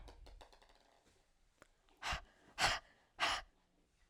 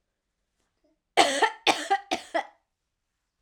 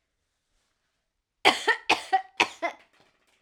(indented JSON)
{
  "exhalation_length": "4.1 s",
  "exhalation_amplitude": 3403,
  "exhalation_signal_mean_std_ratio": 0.34,
  "three_cough_length": "3.4 s",
  "three_cough_amplitude": 29384,
  "three_cough_signal_mean_std_ratio": 0.34,
  "cough_length": "3.4 s",
  "cough_amplitude": 24582,
  "cough_signal_mean_std_ratio": 0.3,
  "survey_phase": "alpha (2021-03-01 to 2021-08-12)",
  "age": "18-44",
  "gender": "Female",
  "wearing_mask": "No",
  "symptom_none": true,
  "smoker_status": "Never smoked",
  "respiratory_condition_asthma": false,
  "respiratory_condition_other": false,
  "recruitment_source": "REACT",
  "submission_delay": "2 days",
  "covid_test_result": "Negative",
  "covid_test_method": "RT-qPCR"
}